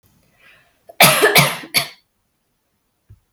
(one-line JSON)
{"cough_length": "3.3 s", "cough_amplitude": 32768, "cough_signal_mean_std_ratio": 0.34, "survey_phase": "beta (2021-08-13 to 2022-03-07)", "age": "18-44", "gender": "Female", "wearing_mask": "No", "symptom_runny_or_blocked_nose": true, "symptom_onset": "7 days", "smoker_status": "Never smoked", "respiratory_condition_asthma": false, "respiratory_condition_other": false, "recruitment_source": "REACT", "submission_delay": "1 day", "covid_test_result": "Negative", "covid_test_method": "RT-qPCR", "influenza_a_test_result": "Negative", "influenza_b_test_result": "Negative"}